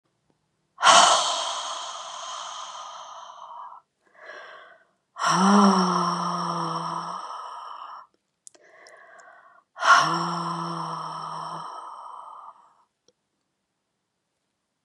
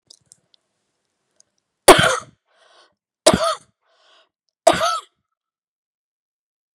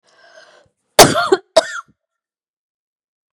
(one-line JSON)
{"exhalation_length": "14.8 s", "exhalation_amplitude": 26094, "exhalation_signal_mean_std_ratio": 0.44, "three_cough_length": "6.7 s", "three_cough_amplitude": 32768, "three_cough_signal_mean_std_ratio": 0.24, "cough_length": "3.3 s", "cough_amplitude": 32768, "cough_signal_mean_std_ratio": 0.26, "survey_phase": "beta (2021-08-13 to 2022-03-07)", "age": "45-64", "gender": "Female", "wearing_mask": "No", "symptom_cough_any": true, "symptom_runny_or_blocked_nose": true, "symptom_shortness_of_breath": true, "symptom_abdominal_pain": true, "symptom_diarrhoea": true, "symptom_fatigue": true, "symptom_headache": true, "symptom_change_to_sense_of_smell_or_taste": true, "symptom_loss_of_taste": true, "symptom_onset": "3 days", "smoker_status": "Never smoked", "respiratory_condition_asthma": false, "respiratory_condition_other": false, "recruitment_source": "Test and Trace", "submission_delay": "2 days", "covid_test_result": "Positive", "covid_test_method": "RT-qPCR", "covid_ct_value": 16.8, "covid_ct_gene": "N gene", "covid_ct_mean": 17.8, "covid_viral_load": "1400000 copies/ml", "covid_viral_load_category": "High viral load (>1M copies/ml)"}